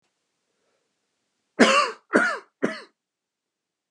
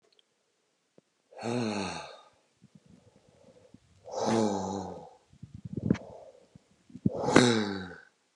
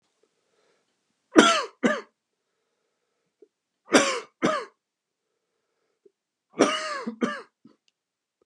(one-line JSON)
{"cough_length": "3.9 s", "cough_amplitude": 26057, "cough_signal_mean_std_ratio": 0.3, "exhalation_length": "8.4 s", "exhalation_amplitude": 27074, "exhalation_signal_mean_std_ratio": 0.39, "three_cough_length": "8.5 s", "three_cough_amplitude": 29204, "three_cough_signal_mean_std_ratio": 0.29, "survey_phase": "beta (2021-08-13 to 2022-03-07)", "age": "18-44", "gender": "Male", "wearing_mask": "No", "symptom_cough_any": true, "symptom_runny_or_blocked_nose": true, "symptom_shortness_of_breath": true, "symptom_sore_throat": true, "symptom_fatigue": true, "symptom_fever_high_temperature": true, "symptom_headache": true, "symptom_change_to_sense_of_smell_or_taste": true, "symptom_loss_of_taste": true, "smoker_status": "Ex-smoker", "respiratory_condition_asthma": false, "respiratory_condition_other": false, "recruitment_source": "Test and Trace", "submission_delay": "2 days", "covid_test_result": "Positive", "covid_test_method": "RT-qPCR", "covid_ct_value": 23.4, "covid_ct_gene": "ORF1ab gene", "covid_ct_mean": 23.8, "covid_viral_load": "15000 copies/ml", "covid_viral_load_category": "Low viral load (10K-1M copies/ml)"}